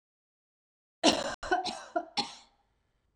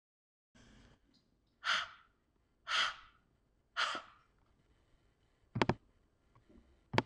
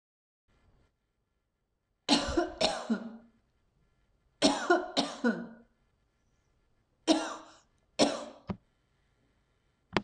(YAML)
cough_length: 3.2 s
cough_amplitude: 10578
cough_signal_mean_std_ratio: 0.35
exhalation_length: 7.1 s
exhalation_amplitude: 8367
exhalation_signal_mean_std_ratio: 0.28
three_cough_length: 10.0 s
three_cough_amplitude: 12645
three_cough_signal_mean_std_ratio: 0.34
survey_phase: alpha (2021-03-01 to 2021-08-12)
age: 45-64
gender: Female
wearing_mask: 'No'
symptom_none: true
smoker_status: Ex-smoker
respiratory_condition_asthma: false
respiratory_condition_other: false
recruitment_source: REACT
submission_delay: 2 days
covid_test_result: Negative
covid_test_method: RT-qPCR